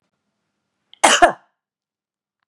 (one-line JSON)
{"cough_length": "2.5 s", "cough_amplitude": 32768, "cough_signal_mean_std_ratio": 0.24, "survey_phase": "beta (2021-08-13 to 2022-03-07)", "age": "45-64", "gender": "Female", "wearing_mask": "No", "symptom_runny_or_blocked_nose": true, "symptom_sore_throat": true, "smoker_status": "Never smoked", "respiratory_condition_asthma": false, "respiratory_condition_other": false, "recruitment_source": "REACT", "submission_delay": "1 day", "covid_test_result": "Negative", "covid_test_method": "RT-qPCR", "influenza_a_test_result": "Unknown/Void", "influenza_b_test_result": "Unknown/Void"}